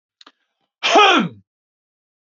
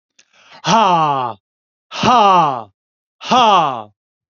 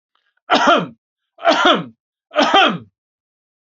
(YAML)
cough_length: 2.4 s
cough_amplitude: 31284
cough_signal_mean_std_ratio: 0.34
exhalation_length: 4.4 s
exhalation_amplitude: 31344
exhalation_signal_mean_std_ratio: 0.55
three_cough_length: 3.7 s
three_cough_amplitude: 32767
three_cough_signal_mean_std_ratio: 0.46
survey_phase: beta (2021-08-13 to 2022-03-07)
age: 65+
gender: Male
wearing_mask: 'No'
symptom_none: true
smoker_status: Ex-smoker
respiratory_condition_asthma: false
respiratory_condition_other: false
recruitment_source: REACT
submission_delay: 1 day
covid_test_result: Negative
covid_test_method: RT-qPCR